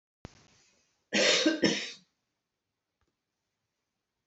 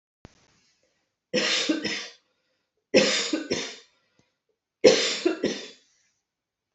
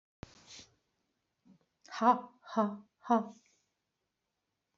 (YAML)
cough_length: 4.3 s
cough_amplitude: 9542
cough_signal_mean_std_ratio: 0.32
three_cough_length: 6.7 s
three_cough_amplitude: 24492
three_cough_signal_mean_std_ratio: 0.38
exhalation_length: 4.8 s
exhalation_amplitude: 8068
exhalation_signal_mean_std_ratio: 0.27
survey_phase: beta (2021-08-13 to 2022-03-07)
age: 45-64
gender: Female
wearing_mask: 'No'
symptom_none: true
smoker_status: Never smoked
respiratory_condition_asthma: false
respiratory_condition_other: false
recruitment_source: REACT
submission_delay: 1 day
covid_test_result: Negative
covid_test_method: RT-qPCR
influenza_a_test_result: Unknown/Void
influenza_b_test_result: Unknown/Void